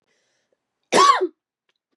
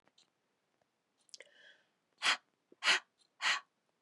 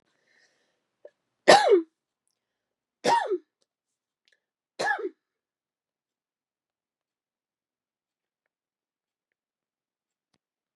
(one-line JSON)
{"cough_length": "2.0 s", "cough_amplitude": 23290, "cough_signal_mean_std_ratio": 0.33, "exhalation_length": "4.0 s", "exhalation_amplitude": 5723, "exhalation_signal_mean_std_ratio": 0.27, "three_cough_length": "10.8 s", "three_cough_amplitude": 28383, "three_cough_signal_mean_std_ratio": 0.2, "survey_phase": "beta (2021-08-13 to 2022-03-07)", "age": "45-64", "gender": "Female", "wearing_mask": "No", "symptom_none": true, "smoker_status": "Ex-smoker", "respiratory_condition_asthma": false, "respiratory_condition_other": false, "recruitment_source": "REACT", "submission_delay": "1 day", "covid_test_result": "Negative", "covid_test_method": "RT-qPCR", "influenza_a_test_result": "Negative", "influenza_b_test_result": "Negative"}